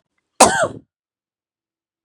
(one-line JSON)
{"three_cough_length": "2.0 s", "three_cough_amplitude": 32768, "three_cough_signal_mean_std_ratio": 0.26, "survey_phase": "beta (2021-08-13 to 2022-03-07)", "age": "18-44", "gender": "Female", "wearing_mask": "No", "symptom_cough_any": true, "symptom_runny_or_blocked_nose": true, "symptom_sore_throat": true, "smoker_status": "Ex-smoker", "respiratory_condition_asthma": false, "respiratory_condition_other": false, "recruitment_source": "Test and Trace", "submission_delay": "2 days", "covid_test_result": "Positive", "covid_test_method": "RT-qPCR"}